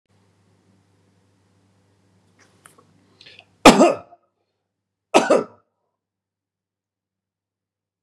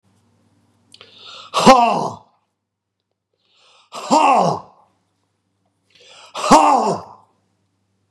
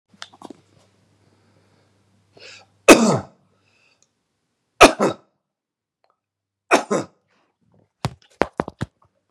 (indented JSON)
{
  "cough_length": "8.0 s",
  "cough_amplitude": 32768,
  "cough_signal_mean_std_ratio": 0.19,
  "exhalation_length": "8.1 s",
  "exhalation_amplitude": 32768,
  "exhalation_signal_mean_std_ratio": 0.35,
  "three_cough_length": "9.3 s",
  "three_cough_amplitude": 32768,
  "three_cough_signal_mean_std_ratio": 0.2,
  "survey_phase": "beta (2021-08-13 to 2022-03-07)",
  "age": "45-64",
  "gender": "Male",
  "wearing_mask": "No",
  "symptom_none": true,
  "smoker_status": "Never smoked",
  "respiratory_condition_asthma": false,
  "respiratory_condition_other": false,
  "recruitment_source": "REACT",
  "submission_delay": "5 days",
  "covid_test_result": "Negative",
  "covid_test_method": "RT-qPCR",
  "influenza_a_test_result": "Negative",
  "influenza_b_test_result": "Negative"
}